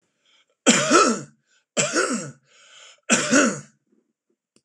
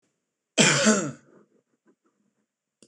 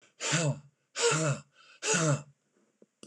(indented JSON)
{
  "three_cough_length": "4.6 s",
  "three_cough_amplitude": 25102,
  "three_cough_signal_mean_std_ratio": 0.44,
  "cough_length": "2.9 s",
  "cough_amplitude": 24863,
  "cough_signal_mean_std_ratio": 0.33,
  "exhalation_length": "3.1 s",
  "exhalation_amplitude": 6271,
  "exhalation_signal_mean_std_ratio": 0.55,
  "survey_phase": "beta (2021-08-13 to 2022-03-07)",
  "age": "65+",
  "gender": "Male",
  "wearing_mask": "No",
  "symptom_none": true,
  "smoker_status": "Never smoked",
  "respiratory_condition_asthma": false,
  "respiratory_condition_other": false,
  "recruitment_source": "REACT",
  "submission_delay": "1 day",
  "covid_test_result": "Negative",
  "covid_test_method": "RT-qPCR"
}